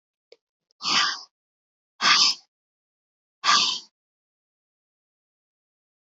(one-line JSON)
{"exhalation_length": "6.1 s", "exhalation_amplitude": 20385, "exhalation_signal_mean_std_ratio": 0.31, "survey_phase": "beta (2021-08-13 to 2022-03-07)", "age": "18-44", "gender": "Female", "wearing_mask": "No", "symptom_cough_any": true, "symptom_runny_or_blocked_nose": true, "symptom_fatigue": true, "smoker_status": "Never smoked", "respiratory_condition_asthma": true, "respiratory_condition_other": false, "recruitment_source": "REACT", "submission_delay": "1 day", "covid_test_result": "Negative", "covid_test_method": "RT-qPCR", "influenza_a_test_result": "Unknown/Void", "influenza_b_test_result": "Unknown/Void"}